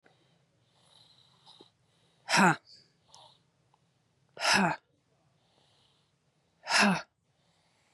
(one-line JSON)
{"exhalation_length": "7.9 s", "exhalation_amplitude": 11729, "exhalation_signal_mean_std_ratio": 0.27, "survey_phase": "beta (2021-08-13 to 2022-03-07)", "age": "18-44", "gender": "Female", "wearing_mask": "No", "symptom_runny_or_blocked_nose": true, "symptom_sore_throat": true, "smoker_status": "Never smoked", "respiratory_condition_asthma": false, "respiratory_condition_other": false, "recruitment_source": "Test and Trace", "submission_delay": "2 days", "covid_test_result": "Positive", "covid_test_method": "RT-qPCR", "covid_ct_value": 28.1, "covid_ct_gene": "ORF1ab gene", "covid_ct_mean": 28.3, "covid_viral_load": "540 copies/ml", "covid_viral_load_category": "Minimal viral load (< 10K copies/ml)"}